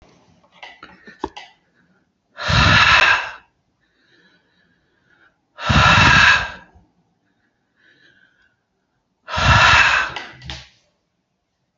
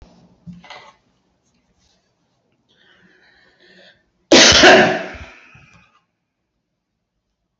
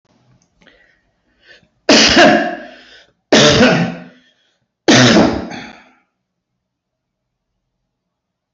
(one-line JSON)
{"exhalation_length": "11.8 s", "exhalation_amplitude": 30777, "exhalation_signal_mean_std_ratio": 0.39, "cough_length": "7.6 s", "cough_amplitude": 32768, "cough_signal_mean_std_ratio": 0.26, "three_cough_length": "8.5 s", "three_cough_amplitude": 32768, "three_cough_signal_mean_std_ratio": 0.39, "survey_phase": "beta (2021-08-13 to 2022-03-07)", "age": "65+", "gender": "Male", "wearing_mask": "No", "symptom_none": true, "smoker_status": "Ex-smoker", "respiratory_condition_asthma": false, "respiratory_condition_other": false, "recruitment_source": "REACT", "submission_delay": "3 days", "covid_test_result": "Negative", "covid_test_method": "RT-qPCR"}